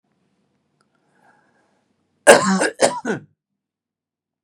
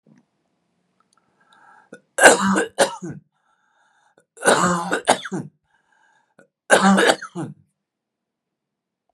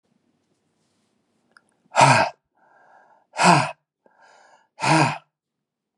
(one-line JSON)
{"cough_length": "4.4 s", "cough_amplitude": 32768, "cough_signal_mean_std_ratio": 0.26, "three_cough_length": "9.1 s", "three_cough_amplitude": 32768, "three_cough_signal_mean_std_ratio": 0.34, "exhalation_length": "6.0 s", "exhalation_amplitude": 27221, "exhalation_signal_mean_std_ratio": 0.31, "survey_phase": "beta (2021-08-13 to 2022-03-07)", "age": "45-64", "gender": "Male", "wearing_mask": "No", "symptom_none": true, "smoker_status": "Never smoked", "respiratory_condition_asthma": false, "respiratory_condition_other": false, "recruitment_source": "REACT", "submission_delay": "1 day", "covid_test_result": "Negative", "covid_test_method": "RT-qPCR", "influenza_a_test_result": "Negative", "influenza_b_test_result": "Negative"}